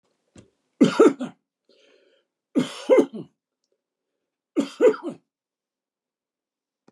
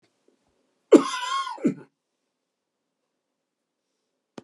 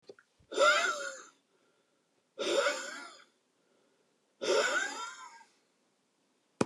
{"three_cough_length": "6.9 s", "three_cough_amplitude": 20833, "three_cough_signal_mean_std_ratio": 0.28, "cough_length": "4.4 s", "cough_amplitude": 28337, "cough_signal_mean_std_ratio": 0.21, "exhalation_length": "6.7 s", "exhalation_amplitude": 9417, "exhalation_signal_mean_std_ratio": 0.41, "survey_phase": "beta (2021-08-13 to 2022-03-07)", "age": "65+", "gender": "Male", "wearing_mask": "No", "symptom_none": true, "smoker_status": "Never smoked", "respiratory_condition_asthma": false, "respiratory_condition_other": false, "recruitment_source": "REACT", "submission_delay": "1 day", "covid_test_result": "Negative", "covid_test_method": "RT-qPCR"}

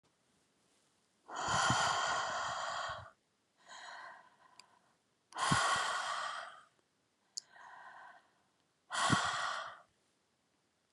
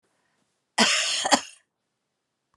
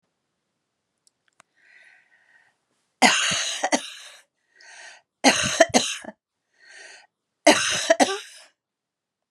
{"exhalation_length": "10.9 s", "exhalation_amplitude": 5872, "exhalation_signal_mean_std_ratio": 0.5, "cough_length": "2.6 s", "cough_amplitude": 21635, "cough_signal_mean_std_ratio": 0.36, "three_cough_length": "9.3 s", "three_cough_amplitude": 32597, "three_cough_signal_mean_std_ratio": 0.33, "survey_phase": "beta (2021-08-13 to 2022-03-07)", "age": "45-64", "gender": "Female", "wearing_mask": "No", "symptom_none": true, "smoker_status": "Never smoked", "respiratory_condition_asthma": false, "respiratory_condition_other": false, "recruitment_source": "REACT", "submission_delay": "1 day", "covid_test_result": "Negative", "covid_test_method": "RT-qPCR", "influenza_a_test_result": "Unknown/Void", "influenza_b_test_result": "Unknown/Void"}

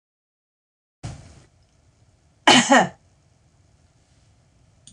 {"cough_length": "4.9 s", "cough_amplitude": 26028, "cough_signal_mean_std_ratio": 0.23, "survey_phase": "beta (2021-08-13 to 2022-03-07)", "age": "65+", "gender": "Female", "wearing_mask": "No", "symptom_none": true, "smoker_status": "Ex-smoker", "respiratory_condition_asthma": false, "respiratory_condition_other": false, "recruitment_source": "REACT", "submission_delay": "3 days", "covid_test_result": "Negative", "covid_test_method": "RT-qPCR"}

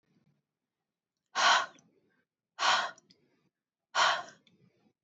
{"exhalation_length": "5.0 s", "exhalation_amplitude": 7568, "exhalation_signal_mean_std_ratio": 0.33, "survey_phase": "beta (2021-08-13 to 2022-03-07)", "age": "18-44", "gender": "Female", "wearing_mask": "No", "symptom_none": true, "smoker_status": "Never smoked", "respiratory_condition_asthma": true, "respiratory_condition_other": false, "recruitment_source": "REACT", "submission_delay": "2 days", "covid_test_result": "Negative", "covid_test_method": "RT-qPCR", "influenza_a_test_result": "Negative", "influenza_b_test_result": "Negative"}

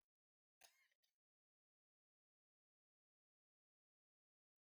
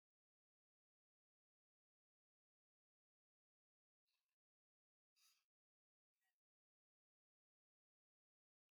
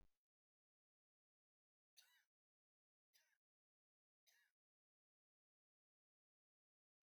{"cough_length": "4.6 s", "cough_amplitude": 104, "cough_signal_mean_std_ratio": 0.15, "exhalation_length": "8.7 s", "exhalation_amplitude": 17, "exhalation_signal_mean_std_ratio": 0.14, "three_cough_length": "7.1 s", "three_cough_amplitude": 71, "three_cough_signal_mean_std_ratio": 0.22, "survey_phase": "beta (2021-08-13 to 2022-03-07)", "age": "65+", "gender": "Male", "wearing_mask": "No", "symptom_none": true, "smoker_status": "Never smoked", "respiratory_condition_asthma": false, "respiratory_condition_other": false, "recruitment_source": "REACT", "submission_delay": "7 days", "covid_test_result": "Negative", "covid_test_method": "RT-qPCR"}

